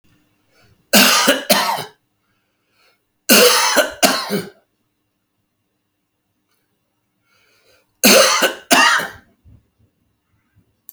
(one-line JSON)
{"cough_length": "10.9 s", "cough_amplitude": 32768, "cough_signal_mean_std_ratio": 0.38, "survey_phase": "alpha (2021-03-01 to 2021-08-12)", "age": "65+", "gender": "Male", "wearing_mask": "No", "symptom_none": true, "smoker_status": "Ex-smoker", "respiratory_condition_asthma": false, "respiratory_condition_other": false, "recruitment_source": "REACT", "submission_delay": "8 days", "covid_test_result": "Negative", "covid_test_method": "RT-qPCR"}